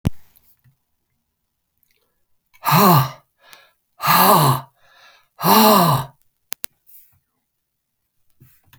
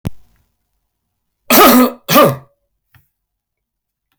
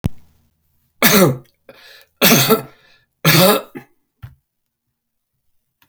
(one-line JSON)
{"exhalation_length": "8.8 s", "exhalation_amplitude": 32767, "exhalation_signal_mean_std_ratio": 0.37, "cough_length": "4.2 s", "cough_amplitude": 32768, "cough_signal_mean_std_ratio": 0.36, "three_cough_length": "5.9 s", "three_cough_amplitude": 32768, "three_cough_signal_mean_std_ratio": 0.37, "survey_phase": "beta (2021-08-13 to 2022-03-07)", "age": "65+", "gender": "Male", "wearing_mask": "No", "symptom_none": true, "smoker_status": "Never smoked", "respiratory_condition_asthma": false, "respiratory_condition_other": false, "recruitment_source": "REACT", "submission_delay": "2 days", "covid_test_result": "Negative", "covid_test_method": "RT-qPCR", "influenza_a_test_result": "Negative", "influenza_b_test_result": "Negative"}